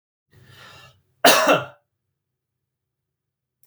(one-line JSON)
{"cough_length": "3.7 s", "cough_amplitude": 31627, "cough_signal_mean_std_ratio": 0.25, "survey_phase": "beta (2021-08-13 to 2022-03-07)", "age": "45-64", "gender": "Male", "wearing_mask": "No", "symptom_none": true, "smoker_status": "Never smoked", "respiratory_condition_asthma": false, "respiratory_condition_other": false, "recruitment_source": "REACT", "submission_delay": "0 days", "covid_test_result": "Negative", "covid_test_method": "RT-qPCR", "influenza_a_test_result": "Negative", "influenza_b_test_result": "Negative"}